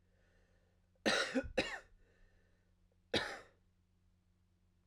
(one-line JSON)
{"cough_length": "4.9 s", "cough_amplitude": 3539, "cough_signal_mean_std_ratio": 0.32, "survey_phase": "alpha (2021-03-01 to 2021-08-12)", "age": "18-44", "gender": "Male", "wearing_mask": "No", "symptom_fatigue": true, "symptom_change_to_sense_of_smell_or_taste": true, "symptom_onset": "6 days", "smoker_status": "Current smoker (e-cigarettes or vapes only)", "respiratory_condition_asthma": false, "respiratory_condition_other": false, "recruitment_source": "Test and Trace", "submission_delay": "1 day", "covid_test_result": "Positive", "covid_test_method": "RT-qPCR", "covid_ct_value": 17.4, "covid_ct_gene": "ORF1ab gene", "covid_ct_mean": 18.4, "covid_viral_load": "940000 copies/ml", "covid_viral_load_category": "Low viral load (10K-1M copies/ml)"}